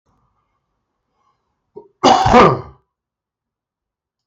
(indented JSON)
{
  "cough_length": "4.3 s",
  "cough_amplitude": 32768,
  "cough_signal_mean_std_ratio": 0.29,
  "survey_phase": "beta (2021-08-13 to 2022-03-07)",
  "age": "45-64",
  "gender": "Male",
  "wearing_mask": "No",
  "symptom_cough_any": true,
  "symptom_runny_or_blocked_nose": true,
  "symptom_fatigue": true,
  "symptom_other": true,
  "symptom_onset": "4 days",
  "smoker_status": "Ex-smoker",
  "respiratory_condition_asthma": false,
  "respiratory_condition_other": false,
  "recruitment_source": "Test and Trace",
  "submission_delay": "2 days",
  "covid_test_result": "Positive",
  "covid_test_method": "RT-qPCR",
  "covid_ct_value": 19.8,
  "covid_ct_gene": "ORF1ab gene",
  "covid_ct_mean": 20.2,
  "covid_viral_load": "230000 copies/ml",
  "covid_viral_load_category": "Low viral load (10K-1M copies/ml)"
}